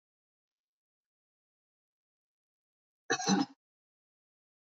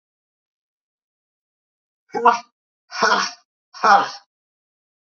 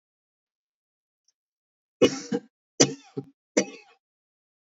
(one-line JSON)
{"cough_length": "4.6 s", "cough_amplitude": 5305, "cough_signal_mean_std_ratio": 0.2, "exhalation_length": "5.1 s", "exhalation_amplitude": 27786, "exhalation_signal_mean_std_ratio": 0.29, "three_cough_length": "4.7 s", "three_cough_amplitude": 23815, "three_cough_signal_mean_std_ratio": 0.21, "survey_phase": "beta (2021-08-13 to 2022-03-07)", "age": "65+", "gender": "Female", "wearing_mask": "No", "symptom_none": true, "smoker_status": "Ex-smoker", "respiratory_condition_asthma": false, "respiratory_condition_other": false, "recruitment_source": "REACT", "submission_delay": "4 days", "covid_test_result": "Negative", "covid_test_method": "RT-qPCR", "influenza_a_test_result": "Negative", "influenza_b_test_result": "Negative"}